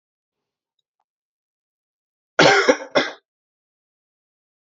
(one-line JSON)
{"cough_length": "4.6 s", "cough_amplitude": 32762, "cough_signal_mean_std_ratio": 0.25, "survey_phase": "alpha (2021-03-01 to 2021-08-12)", "age": "18-44", "gender": "Male", "wearing_mask": "No", "symptom_shortness_of_breath": true, "symptom_fatigue": true, "symptom_headache": true, "symptom_change_to_sense_of_smell_or_taste": true, "symptom_loss_of_taste": true, "symptom_onset": "3 days", "smoker_status": "Ex-smoker", "respiratory_condition_asthma": true, "respiratory_condition_other": false, "recruitment_source": "Test and Trace", "submission_delay": "2 days", "covid_test_result": "Positive", "covid_test_method": "RT-qPCR", "covid_ct_value": 28.7, "covid_ct_gene": "N gene"}